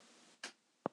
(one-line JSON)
{"cough_length": "0.9 s", "cough_amplitude": 3399, "cough_signal_mean_std_ratio": 0.22, "survey_phase": "beta (2021-08-13 to 2022-03-07)", "age": "45-64", "gender": "Male", "wearing_mask": "No", "symptom_none": true, "smoker_status": "Never smoked", "respiratory_condition_asthma": false, "respiratory_condition_other": false, "recruitment_source": "REACT", "submission_delay": "4 days", "covid_test_result": "Negative", "covid_test_method": "RT-qPCR", "influenza_a_test_result": "Negative", "influenza_b_test_result": "Negative"}